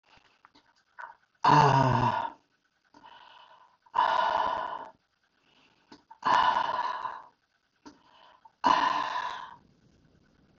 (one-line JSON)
{"exhalation_length": "10.6 s", "exhalation_amplitude": 13128, "exhalation_signal_mean_std_ratio": 0.43, "survey_phase": "beta (2021-08-13 to 2022-03-07)", "age": "65+", "gender": "Female", "wearing_mask": "No", "symptom_none": true, "smoker_status": "Never smoked", "respiratory_condition_asthma": false, "respiratory_condition_other": false, "recruitment_source": "REACT", "submission_delay": "2 days", "covid_test_result": "Negative", "covid_test_method": "RT-qPCR", "influenza_a_test_result": "Negative", "influenza_b_test_result": "Negative"}